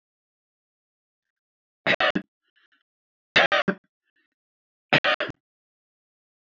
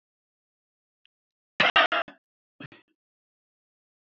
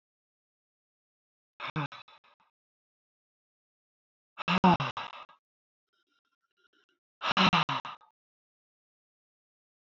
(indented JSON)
{
  "three_cough_length": "6.6 s",
  "three_cough_amplitude": 20848,
  "three_cough_signal_mean_std_ratio": 0.25,
  "cough_length": "4.1 s",
  "cough_amplitude": 18323,
  "cough_signal_mean_std_ratio": 0.22,
  "exhalation_length": "9.9 s",
  "exhalation_amplitude": 9976,
  "exhalation_signal_mean_std_ratio": 0.24,
  "survey_phase": "alpha (2021-03-01 to 2021-08-12)",
  "age": "65+",
  "gender": "Female",
  "wearing_mask": "No",
  "symptom_none": true,
  "smoker_status": "Never smoked",
  "respiratory_condition_asthma": true,
  "respiratory_condition_other": false,
  "recruitment_source": "REACT",
  "submission_delay": "2 days",
  "covid_test_result": "Negative",
  "covid_test_method": "RT-qPCR"
}